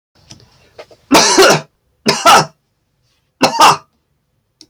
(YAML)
cough_length: 4.7 s
cough_amplitude: 32768
cough_signal_mean_std_ratio: 0.42
survey_phase: alpha (2021-03-01 to 2021-08-12)
age: 65+
gender: Male
wearing_mask: 'No'
symptom_none: true
smoker_status: Ex-smoker
respiratory_condition_asthma: false
respiratory_condition_other: false
recruitment_source: REACT
submission_delay: 4 days
covid_test_result: Negative
covid_test_method: RT-qPCR